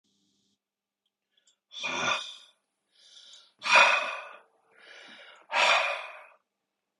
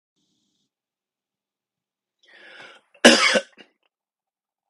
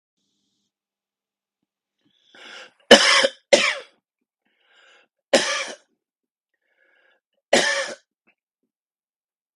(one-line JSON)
{"exhalation_length": "7.0 s", "exhalation_amplitude": 16868, "exhalation_signal_mean_std_ratio": 0.35, "cough_length": "4.7 s", "cough_amplitude": 32768, "cough_signal_mean_std_ratio": 0.2, "three_cough_length": "9.6 s", "three_cough_amplitude": 32768, "three_cough_signal_mean_std_ratio": 0.25, "survey_phase": "beta (2021-08-13 to 2022-03-07)", "age": "45-64", "gender": "Male", "wearing_mask": "No", "symptom_none": true, "smoker_status": "Never smoked", "respiratory_condition_asthma": true, "respiratory_condition_other": false, "recruitment_source": "REACT", "submission_delay": "1 day", "covid_test_result": "Negative", "covid_test_method": "RT-qPCR", "influenza_a_test_result": "Negative", "influenza_b_test_result": "Negative"}